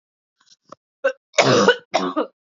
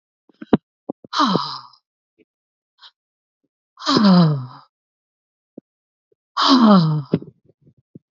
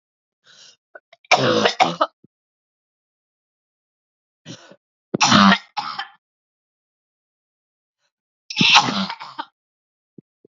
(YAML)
cough_length: 2.6 s
cough_amplitude: 28186
cough_signal_mean_std_ratio: 0.41
exhalation_length: 8.1 s
exhalation_amplitude: 31588
exhalation_signal_mean_std_ratio: 0.37
three_cough_length: 10.5 s
three_cough_amplitude: 32768
three_cough_signal_mean_std_ratio: 0.3
survey_phase: beta (2021-08-13 to 2022-03-07)
age: 18-44
gender: Female
wearing_mask: 'No'
symptom_new_continuous_cough: true
symptom_runny_or_blocked_nose: true
symptom_shortness_of_breath: true
symptom_sore_throat: true
symptom_fatigue: true
symptom_headache: true
symptom_change_to_sense_of_smell_or_taste: true
symptom_loss_of_taste: true
symptom_onset: 3 days
smoker_status: Never smoked
respiratory_condition_asthma: false
respiratory_condition_other: false
recruitment_source: Test and Trace
submission_delay: 2 days
covid_test_result: Positive
covid_test_method: RT-qPCR
covid_ct_value: 11.7
covid_ct_gene: ORF1ab gene